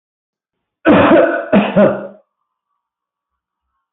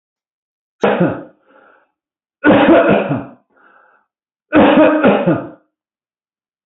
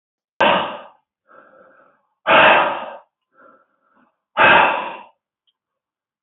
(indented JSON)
{
  "cough_length": "3.9 s",
  "cough_amplitude": 30682,
  "cough_signal_mean_std_ratio": 0.43,
  "three_cough_length": "6.7 s",
  "three_cough_amplitude": 30900,
  "three_cough_signal_mean_std_ratio": 0.46,
  "exhalation_length": "6.2 s",
  "exhalation_amplitude": 27026,
  "exhalation_signal_mean_std_ratio": 0.37,
  "survey_phase": "beta (2021-08-13 to 2022-03-07)",
  "age": "65+",
  "gender": "Male",
  "wearing_mask": "No",
  "symptom_cough_any": true,
  "symptom_runny_or_blocked_nose": true,
  "symptom_fatigue": true,
  "symptom_headache": true,
  "symptom_onset": "4 days",
  "smoker_status": "Ex-smoker",
  "respiratory_condition_asthma": false,
  "respiratory_condition_other": false,
  "recruitment_source": "Test and Trace",
  "submission_delay": "1 day",
  "covid_test_result": "Positive",
  "covid_test_method": "RT-qPCR",
  "covid_ct_value": 18.2,
  "covid_ct_gene": "ORF1ab gene",
  "covid_ct_mean": 18.3,
  "covid_viral_load": "960000 copies/ml",
  "covid_viral_load_category": "Low viral load (10K-1M copies/ml)"
}